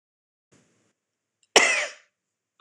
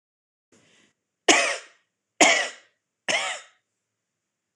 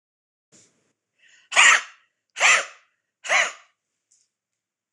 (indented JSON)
{
  "cough_length": "2.6 s",
  "cough_amplitude": 26028,
  "cough_signal_mean_std_ratio": 0.24,
  "three_cough_length": "4.6 s",
  "three_cough_amplitude": 25592,
  "three_cough_signal_mean_std_ratio": 0.31,
  "exhalation_length": "4.9 s",
  "exhalation_amplitude": 25884,
  "exhalation_signal_mean_std_ratio": 0.3,
  "survey_phase": "beta (2021-08-13 to 2022-03-07)",
  "age": "45-64",
  "gender": "Female",
  "wearing_mask": "No",
  "symptom_cough_any": true,
  "symptom_runny_or_blocked_nose": true,
  "symptom_onset": "12 days",
  "smoker_status": "Ex-smoker",
  "respiratory_condition_asthma": false,
  "respiratory_condition_other": false,
  "recruitment_source": "REACT",
  "submission_delay": "0 days",
  "covid_test_result": "Negative",
  "covid_test_method": "RT-qPCR",
  "influenza_a_test_result": "Negative",
  "influenza_b_test_result": "Negative"
}